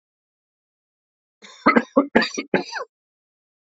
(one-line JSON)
{"cough_length": "3.8 s", "cough_amplitude": 32767, "cough_signal_mean_std_ratio": 0.28, "survey_phase": "alpha (2021-03-01 to 2021-08-12)", "age": "45-64", "gender": "Male", "wearing_mask": "No", "symptom_cough_any": true, "symptom_new_continuous_cough": true, "symptom_fatigue": true, "symptom_onset": "3 days", "smoker_status": "Current smoker (e-cigarettes or vapes only)", "respiratory_condition_asthma": false, "respiratory_condition_other": false, "recruitment_source": "Test and Trace", "submission_delay": "2 days", "covid_test_result": "Positive", "covid_test_method": "RT-qPCR", "covid_ct_value": 16.3, "covid_ct_gene": "N gene", "covid_ct_mean": 16.5, "covid_viral_load": "3800000 copies/ml", "covid_viral_load_category": "High viral load (>1M copies/ml)"}